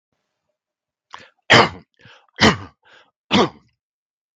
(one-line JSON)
{"three_cough_length": "4.4 s", "three_cough_amplitude": 32768, "three_cough_signal_mean_std_ratio": 0.27, "survey_phase": "beta (2021-08-13 to 2022-03-07)", "age": "45-64", "gender": "Male", "wearing_mask": "No", "symptom_none": true, "smoker_status": "Current smoker (1 to 10 cigarettes per day)", "respiratory_condition_asthma": false, "respiratory_condition_other": false, "recruitment_source": "REACT", "submission_delay": "1 day", "covid_test_result": "Negative", "covid_test_method": "RT-qPCR", "influenza_a_test_result": "Negative", "influenza_b_test_result": "Negative"}